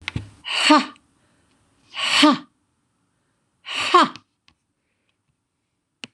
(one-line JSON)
{"exhalation_length": "6.1 s", "exhalation_amplitude": 26027, "exhalation_signal_mean_std_ratio": 0.33, "survey_phase": "beta (2021-08-13 to 2022-03-07)", "age": "65+", "gender": "Female", "wearing_mask": "No", "symptom_none": true, "smoker_status": "Ex-smoker", "respiratory_condition_asthma": false, "respiratory_condition_other": false, "recruitment_source": "REACT", "submission_delay": "0 days", "covid_test_result": "Negative", "covid_test_method": "RT-qPCR", "influenza_a_test_result": "Unknown/Void", "influenza_b_test_result": "Unknown/Void"}